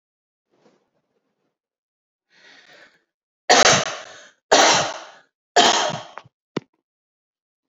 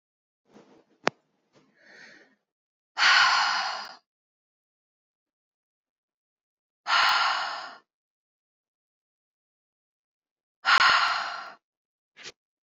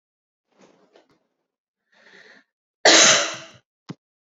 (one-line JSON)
{"three_cough_length": "7.7 s", "three_cough_amplitude": 32767, "three_cough_signal_mean_std_ratio": 0.31, "exhalation_length": "12.6 s", "exhalation_amplitude": 27206, "exhalation_signal_mean_std_ratio": 0.33, "cough_length": "4.3 s", "cough_amplitude": 30232, "cough_signal_mean_std_ratio": 0.26, "survey_phase": "beta (2021-08-13 to 2022-03-07)", "age": "18-44", "gender": "Female", "wearing_mask": "No", "symptom_none": true, "smoker_status": "Never smoked", "respiratory_condition_asthma": false, "respiratory_condition_other": false, "recruitment_source": "REACT", "submission_delay": "2 days", "covid_test_result": "Negative", "covid_test_method": "RT-qPCR"}